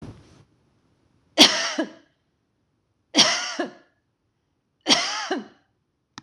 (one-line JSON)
{"three_cough_length": "6.2 s", "three_cough_amplitude": 26028, "three_cough_signal_mean_std_ratio": 0.32, "survey_phase": "beta (2021-08-13 to 2022-03-07)", "age": "45-64", "gender": "Female", "wearing_mask": "No", "symptom_none": true, "smoker_status": "Never smoked", "respiratory_condition_asthma": false, "respiratory_condition_other": false, "recruitment_source": "REACT", "submission_delay": "2 days", "covid_test_result": "Negative", "covid_test_method": "RT-qPCR", "influenza_a_test_result": "Negative", "influenza_b_test_result": "Negative"}